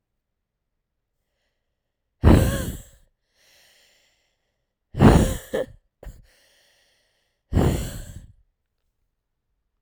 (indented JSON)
{
  "exhalation_length": "9.8 s",
  "exhalation_amplitude": 32767,
  "exhalation_signal_mean_std_ratio": 0.27,
  "survey_phase": "alpha (2021-03-01 to 2021-08-12)",
  "age": "18-44",
  "gender": "Female",
  "wearing_mask": "No",
  "symptom_cough_any": true,
  "symptom_new_continuous_cough": true,
  "symptom_shortness_of_breath": true,
  "symptom_fatigue": true,
  "symptom_headache": true,
  "smoker_status": "Never smoked",
  "respiratory_condition_asthma": false,
  "respiratory_condition_other": false,
  "recruitment_source": "Test and Trace",
  "submission_delay": "2 days",
  "covid_test_result": "Positive",
  "covid_test_method": "RT-qPCR",
  "covid_ct_value": 24.0,
  "covid_ct_gene": "ORF1ab gene",
  "covid_ct_mean": 24.5,
  "covid_viral_load": "9200 copies/ml",
  "covid_viral_load_category": "Minimal viral load (< 10K copies/ml)"
}